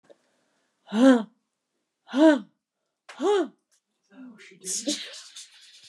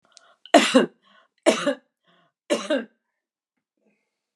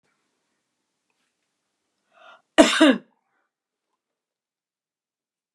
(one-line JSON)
{"exhalation_length": "5.9 s", "exhalation_amplitude": 18064, "exhalation_signal_mean_std_ratio": 0.33, "three_cough_length": "4.4 s", "three_cough_amplitude": 32150, "three_cough_signal_mean_std_ratio": 0.3, "cough_length": "5.5 s", "cough_amplitude": 32767, "cough_signal_mean_std_ratio": 0.19, "survey_phase": "beta (2021-08-13 to 2022-03-07)", "age": "65+", "gender": "Female", "wearing_mask": "No", "symptom_none": true, "smoker_status": "Never smoked", "respiratory_condition_asthma": false, "respiratory_condition_other": false, "recruitment_source": "REACT", "submission_delay": "1 day", "covid_test_result": "Negative", "covid_test_method": "RT-qPCR", "influenza_a_test_result": "Negative", "influenza_b_test_result": "Negative"}